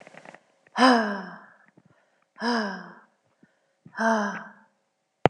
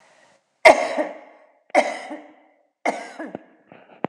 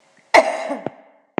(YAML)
exhalation_length: 5.3 s
exhalation_amplitude: 26028
exhalation_signal_mean_std_ratio: 0.36
three_cough_length: 4.1 s
three_cough_amplitude: 26028
three_cough_signal_mean_std_ratio: 0.3
cough_length: 1.4 s
cough_amplitude: 26028
cough_signal_mean_std_ratio: 0.36
survey_phase: alpha (2021-03-01 to 2021-08-12)
age: 45-64
gender: Female
wearing_mask: 'No'
symptom_none: true
smoker_status: Never smoked
respiratory_condition_asthma: true
respiratory_condition_other: false
recruitment_source: REACT
submission_delay: 3 days
covid_test_result: Negative
covid_test_method: RT-qPCR